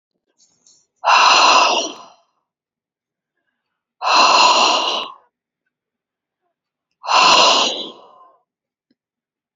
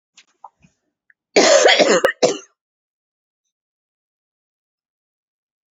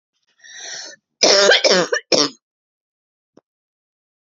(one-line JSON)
{"exhalation_length": "9.6 s", "exhalation_amplitude": 30673, "exhalation_signal_mean_std_ratio": 0.43, "cough_length": "5.7 s", "cough_amplitude": 30898, "cough_signal_mean_std_ratio": 0.31, "three_cough_length": "4.4 s", "three_cough_amplitude": 32768, "three_cough_signal_mean_std_ratio": 0.36, "survey_phase": "alpha (2021-03-01 to 2021-08-12)", "age": "18-44", "gender": "Female", "wearing_mask": "No", "symptom_fatigue": true, "symptom_headache": true, "symptom_onset": "11 days", "smoker_status": "Current smoker (e-cigarettes or vapes only)", "respiratory_condition_asthma": false, "respiratory_condition_other": false, "recruitment_source": "REACT", "submission_delay": "1 day", "covid_test_result": "Negative", "covid_test_method": "RT-qPCR"}